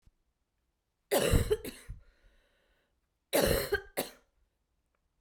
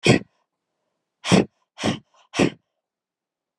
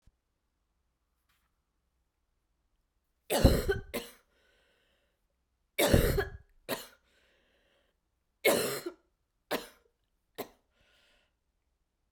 cough_length: 5.2 s
cough_amplitude: 8055
cough_signal_mean_std_ratio: 0.35
exhalation_length: 3.6 s
exhalation_amplitude: 25180
exhalation_signal_mean_std_ratio: 0.3
three_cough_length: 12.1 s
three_cough_amplitude: 13363
three_cough_signal_mean_std_ratio: 0.27
survey_phase: beta (2021-08-13 to 2022-03-07)
age: 18-44
gender: Female
wearing_mask: 'No'
symptom_runny_or_blocked_nose: true
symptom_onset: 3 days
smoker_status: Never smoked
respiratory_condition_asthma: false
respiratory_condition_other: false
recruitment_source: Test and Trace
submission_delay: 2 days
covid_test_result: Positive
covid_test_method: RT-qPCR
covid_ct_value: 21.9
covid_ct_gene: N gene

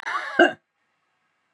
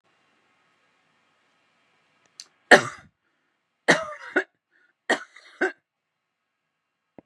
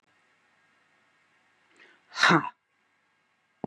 cough_length: 1.5 s
cough_amplitude: 25602
cough_signal_mean_std_ratio: 0.31
three_cough_length: 7.3 s
three_cough_amplitude: 32767
three_cough_signal_mean_std_ratio: 0.18
exhalation_length: 3.7 s
exhalation_amplitude: 14570
exhalation_signal_mean_std_ratio: 0.22
survey_phase: beta (2021-08-13 to 2022-03-07)
age: 65+
gender: Female
wearing_mask: 'No'
symptom_none: true
smoker_status: Ex-smoker
respiratory_condition_asthma: false
respiratory_condition_other: false
recruitment_source: REACT
submission_delay: 3 days
covid_test_result: Negative
covid_test_method: RT-qPCR
influenza_a_test_result: Negative
influenza_b_test_result: Negative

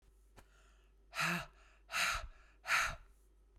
exhalation_length: 3.6 s
exhalation_amplitude: 3121
exhalation_signal_mean_std_ratio: 0.46
survey_phase: beta (2021-08-13 to 2022-03-07)
age: 45-64
gender: Female
wearing_mask: 'No'
symptom_none: true
smoker_status: Current smoker (1 to 10 cigarettes per day)
respiratory_condition_asthma: false
respiratory_condition_other: false
recruitment_source: REACT
submission_delay: 3 days
covid_test_result: Negative
covid_test_method: RT-qPCR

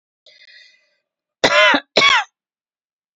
cough_length: 3.2 s
cough_amplitude: 29452
cough_signal_mean_std_ratio: 0.36
survey_phase: beta (2021-08-13 to 2022-03-07)
age: 65+
gender: Female
wearing_mask: 'No'
symptom_none: true
smoker_status: Never smoked
respiratory_condition_asthma: true
respiratory_condition_other: false
recruitment_source: REACT
submission_delay: 1 day
covid_test_result: Negative
covid_test_method: RT-qPCR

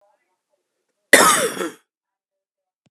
cough_length: 2.9 s
cough_amplitude: 32768
cough_signal_mean_std_ratio: 0.29
survey_phase: beta (2021-08-13 to 2022-03-07)
age: 45-64
gender: Male
wearing_mask: 'No'
symptom_cough_any: true
symptom_new_continuous_cough: true
symptom_shortness_of_breath: true
symptom_abdominal_pain: true
symptom_fatigue: true
symptom_fever_high_temperature: true
symptom_headache: true
symptom_change_to_sense_of_smell_or_taste: true
symptom_loss_of_taste: true
symptom_onset: 5 days
smoker_status: Ex-smoker
respiratory_condition_asthma: false
respiratory_condition_other: false
recruitment_source: Test and Trace
submission_delay: 2 days
covid_test_result: Positive
covid_test_method: RT-qPCR
covid_ct_value: 16.0
covid_ct_gene: ORF1ab gene
covid_ct_mean: 16.4
covid_viral_load: 4200000 copies/ml
covid_viral_load_category: High viral load (>1M copies/ml)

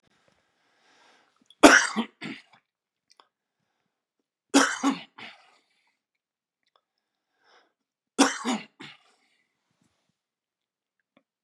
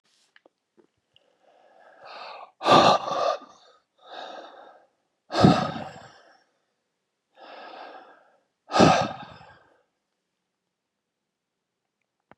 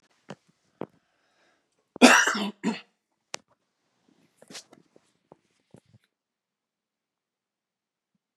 three_cough_length: 11.4 s
three_cough_amplitude: 32767
three_cough_signal_mean_std_ratio: 0.2
exhalation_length: 12.4 s
exhalation_amplitude: 25783
exhalation_signal_mean_std_ratio: 0.28
cough_length: 8.4 s
cough_amplitude: 27220
cough_signal_mean_std_ratio: 0.18
survey_phase: beta (2021-08-13 to 2022-03-07)
age: 45-64
gender: Male
wearing_mask: 'No'
symptom_cough_any: true
symptom_new_continuous_cough: true
symptom_runny_or_blocked_nose: true
symptom_sore_throat: true
symptom_abdominal_pain: true
symptom_fatigue: true
symptom_fever_high_temperature: true
symptom_headache: true
symptom_onset: 3 days
smoker_status: Never smoked
respiratory_condition_asthma: false
respiratory_condition_other: false
recruitment_source: Test and Trace
submission_delay: 1 day
covid_test_result: Positive
covid_test_method: RT-qPCR
covid_ct_value: 24.8
covid_ct_gene: ORF1ab gene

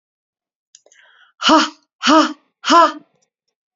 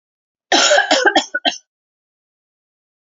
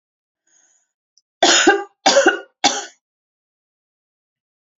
exhalation_length: 3.8 s
exhalation_amplitude: 32064
exhalation_signal_mean_std_ratio: 0.37
cough_length: 3.1 s
cough_amplitude: 31514
cough_signal_mean_std_ratio: 0.4
three_cough_length: 4.8 s
three_cough_amplitude: 30126
three_cough_signal_mean_std_ratio: 0.33
survey_phase: alpha (2021-03-01 to 2021-08-12)
age: 18-44
gender: Female
wearing_mask: 'No'
symptom_none: true
smoker_status: Ex-smoker
respiratory_condition_asthma: false
respiratory_condition_other: false
recruitment_source: REACT
submission_delay: 2 days
covid_test_result: Negative
covid_test_method: RT-qPCR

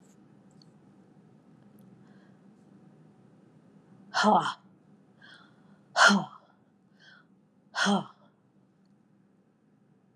exhalation_length: 10.2 s
exhalation_amplitude: 17588
exhalation_signal_mean_std_ratio: 0.26
survey_phase: alpha (2021-03-01 to 2021-08-12)
age: 45-64
gender: Female
wearing_mask: 'No'
symptom_none: true
smoker_status: Ex-smoker
respiratory_condition_asthma: false
respiratory_condition_other: false
recruitment_source: Test and Trace
submission_delay: 0 days
covid_test_result: Negative
covid_test_method: LFT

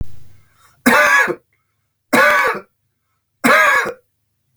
three_cough_length: 4.6 s
three_cough_amplitude: 32768
three_cough_signal_mean_std_ratio: 0.51
survey_phase: beta (2021-08-13 to 2022-03-07)
age: 45-64
gender: Male
wearing_mask: 'No'
symptom_none: true
smoker_status: Ex-smoker
respiratory_condition_asthma: false
respiratory_condition_other: false
recruitment_source: Test and Trace
submission_delay: 2 days
covid_test_result: Negative
covid_test_method: RT-qPCR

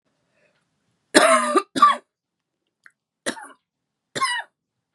three_cough_length: 4.9 s
three_cough_amplitude: 32688
three_cough_signal_mean_std_ratio: 0.32
survey_phase: beta (2021-08-13 to 2022-03-07)
age: 18-44
gender: Female
wearing_mask: 'No'
symptom_cough_any: true
symptom_runny_or_blocked_nose: true
symptom_sore_throat: true
symptom_fatigue: true
symptom_headache: true
smoker_status: Current smoker (11 or more cigarettes per day)
respiratory_condition_asthma: false
respiratory_condition_other: false
recruitment_source: Test and Trace
submission_delay: 1 day
covid_test_result: Positive
covid_test_method: LFT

